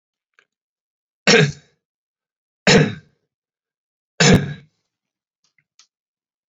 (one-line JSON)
{"three_cough_length": "6.5 s", "three_cough_amplitude": 29589, "three_cough_signal_mean_std_ratio": 0.27, "survey_phase": "beta (2021-08-13 to 2022-03-07)", "age": "18-44", "gender": "Male", "wearing_mask": "No", "symptom_none": true, "smoker_status": "Never smoked", "respiratory_condition_asthma": false, "respiratory_condition_other": false, "recruitment_source": "REACT", "submission_delay": "1 day", "covid_test_result": "Negative", "covid_test_method": "RT-qPCR", "influenza_a_test_result": "Negative", "influenza_b_test_result": "Negative"}